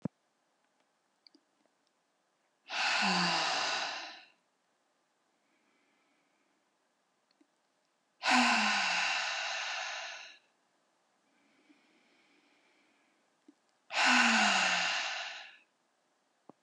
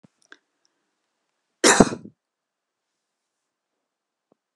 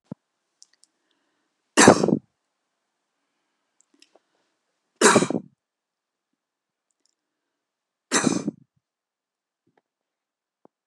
{"exhalation_length": "16.6 s", "exhalation_amplitude": 7425, "exhalation_signal_mean_std_ratio": 0.42, "cough_length": "4.6 s", "cough_amplitude": 32768, "cough_signal_mean_std_ratio": 0.17, "three_cough_length": "10.9 s", "three_cough_amplitude": 32768, "three_cough_signal_mean_std_ratio": 0.2, "survey_phase": "alpha (2021-03-01 to 2021-08-12)", "age": "65+", "gender": "Female", "wearing_mask": "No", "symptom_none": true, "symptom_onset": "12 days", "smoker_status": "Never smoked", "respiratory_condition_asthma": false, "respiratory_condition_other": false, "recruitment_source": "REACT", "submission_delay": "1 day", "covid_test_result": "Negative", "covid_test_method": "RT-qPCR"}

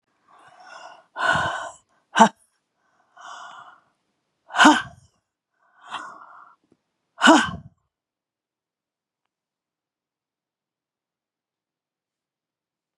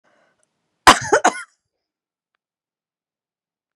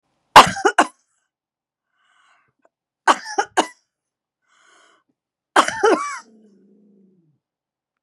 {"exhalation_length": "13.0 s", "exhalation_amplitude": 32767, "exhalation_signal_mean_std_ratio": 0.22, "cough_length": "3.8 s", "cough_amplitude": 32768, "cough_signal_mean_std_ratio": 0.2, "three_cough_length": "8.0 s", "three_cough_amplitude": 32768, "three_cough_signal_mean_std_ratio": 0.23, "survey_phase": "beta (2021-08-13 to 2022-03-07)", "age": "65+", "gender": "Female", "wearing_mask": "No", "symptom_cough_any": true, "symptom_sore_throat": true, "symptom_onset": "12 days", "smoker_status": "Ex-smoker", "respiratory_condition_asthma": false, "respiratory_condition_other": false, "recruitment_source": "REACT", "submission_delay": "2 days", "covid_test_result": "Negative", "covid_test_method": "RT-qPCR"}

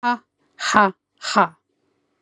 {"exhalation_length": "2.2 s", "exhalation_amplitude": 32767, "exhalation_signal_mean_std_ratio": 0.37, "survey_phase": "beta (2021-08-13 to 2022-03-07)", "age": "18-44", "gender": "Female", "wearing_mask": "No", "symptom_none": true, "smoker_status": "Never smoked", "respiratory_condition_asthma": false, "respiratory_condition_other": false, "recruitment_source": "Test and Trace", "submission_delay": "1 day", "covid_test_result": "Negative", "covid_test_method": "RT-qPCR"}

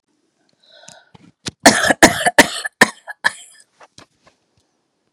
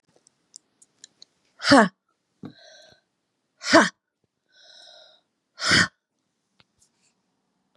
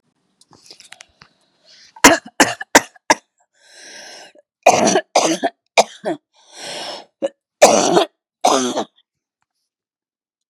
{"cough_length": "5.1 s", "cough_amplitude": 32768, "cough_signal_mean_std_ratio": 0.28, "exhalation_length": "7.8 s", "exhalation_amplitude": 28278, "exhalation_signal_mean_std_ratio": 0.23, "three_cough_length": "10.5 s", "three_cough_amplitude": 32768, "three_cough_signal_mean_std_ratio": 0.33, "survey_phase": "beta (2021-08-13 to 2022-03-07)", "age": "45-64", "gender": "Female", "wearing_mask": "No", "symptom_diarrhoea": true, "smoker_status": "Never smoked", "respiratory_condition_asthma": false, "respiratory_condition_other": true, "recruitment_source": "REACT", "submission_delay": "2 days", "covid_test_result": "Negative", "covid_test_method": "RT-qPCR", "influenza_a_test_result": "Negative", "influenza_b_test_result": "Negative"}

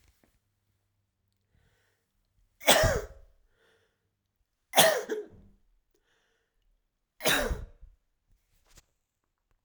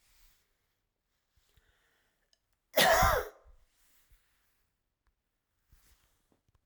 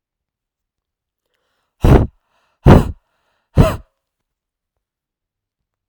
{"three_cough_length": "9.6 s", "three_cough_amplitude": 19896, "three_cough_signal_mean_std_ratio": 0.25, "cough_length": "6.7 s", "cough_amplitude": 8133, "cough_signal_mean_std_ratio": 0.23, "exhalation_length": "5.9 s", "exhalation_amplitude": 32768, "exhalation_signal_mean_std_ratio": 0.24, "survey_phase": "alpha (2021-03-01 to 2021-08-12)", "age": "18-44", "gender": "Male", "wearing_mask": "No", "symptom_none": true, "smoker_status": "Never smoked", "respiratory_condition_asthma": false, "respiratory_condition_other": false, "recruitment_source": "REACT", "submission_delay": "0 days", "covid_test_result": "Negative", "covid_test_method": "RT-qPCR"}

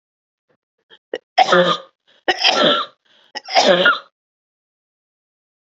{"three_cough_length": "5.7 s", "three_cough_amplitude": 29476, "three_cough_signal_mean_std_ratio": 0.4, "survey_phase": "beta (2021-08-13 to 2022-03-07)", "age": "18-44", "gender": "Female", "wearing_mask": "No", "symptom_none": true, "symptom_onset": "5 days", "smoker_status": "Ex-smoker", "respiratory_condition_asthma": false, "respiratory_condition_other": false, "recruitment_source": "REACT", "submission_delay": "1 day", "covid_test_result": "Negative", "covid_test_method": "RT-qPCR", "influenza_a_test_result": "Negative", "influenza_b_test_result": "Negative"}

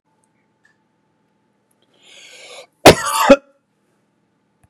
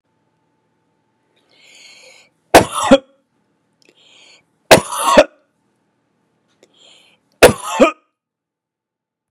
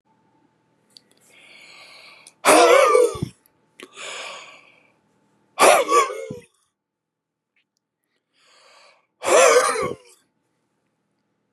{"cough_length": "4.7 s", "cough_amplitude": 32768, "cough_signal_mean_std_ratio": 0.21, "three_cough_length": "9.3 s", "three_cough_amplitude": 32768, "three_cough_signal_mean_std_ratio": 0.24, "exhalation_length": "11.5 s", "exhalation_amplitude": 30319, "exhalation_signal_mean_std_ratio": 0.34, "survey_phase": "beta (2021-08-13 to 2022-03-07)", "age": "65+", "gender": "Male", "wearing_mask": "No", "symptom_none": true, "smoker_status": "Never smoked", "respiratory_condition_asthma": false, "respiratory_condition_other": false, "recruitment_source": "REACT", "submission_delay": "1 day", "covid_test_result": "Negative", "covid_test_method": "RT-qPCR", "influenza_a_test_result": "Negative", "influenza_b_test_result": "Negative"}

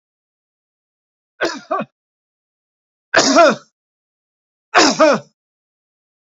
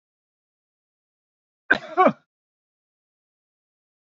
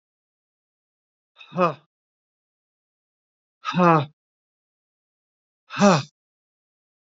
{"three_cough_length": "6.4 s", "three_cough_amplitude": 29258, "three_cough_signal_mean_std_ratio": 0.32, "cough_length": "4.1 s", "cough_amplitude": 22340, "cough_signal_mean_std_ratio": 0.18, "exhalation_length": "7.1 s", "exhalation_amplitude": 26946, "exhalation_signal_mean_std_ratio": 0.24, "survey_phase": "beta (2021-08-13 to 2022-03-07)", "age": "65+", "gender": "Male", "wearing_mask": "No", "symptom_none": true, "smoker_status": "Never smoked", "respiratory_condition_asthma": false, "respiratory_condition_other": false, "recruitment_source": "REACT", "submission_delay": "2 days", "covid_test_result": "Negative", "covid_test_method": "RT-qPCR", "influenza_a_test_result": "Negative", "influenza_b_test_result": "Negative"}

